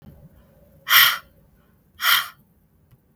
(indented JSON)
{
  "exhalation_length": "3.2 s",
  "exhalation_amplitude": 32766,
  "exhalation_signal_mean_std_ratio": 0.32,
  "survey_phase": "beta (2021-08-13 to 2022-03-07)",
  "age": "45-64",
  "gender": "Female",
  "wearing_mask": "No",
  "symptom_none": true,
  "smoker_status": "Ex-smoker",
  "respiratory_condition_asthma": false,
  "respiratory_condition_other": false,
  "recruitment_source": "REACT",
  "submission_delay": "0 days",
  "covid_test_result": "Negative",
  "covid_test_method": "RT-qPCR",
  "influenza_a_test_result": "Unknown/Void",
  "influenza_b_test_result": "Unknown/Void"
}